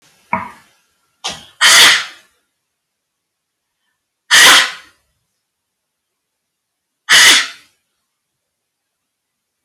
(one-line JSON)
{"exhalation_length": "9.6 s", "exhalation_amplitude": 32768, "exhalation_signal_mean_std_ratio": 0.31, "survey_phase": "alpha (2021-03-01 to 2021-08-12)", "age": "45-64", "gender": "Female", "wearing_mask": "No", "symptom_none": true, "smoker_status": "Ex-smoker", "respiratory_condition_asthma": false, "respiratory_condition_other": false, "recruitment_source": "REACT", "submission_delay": "1 day", "covid_test_result": "Negative", "covid_test_method": "RT-qPCR"}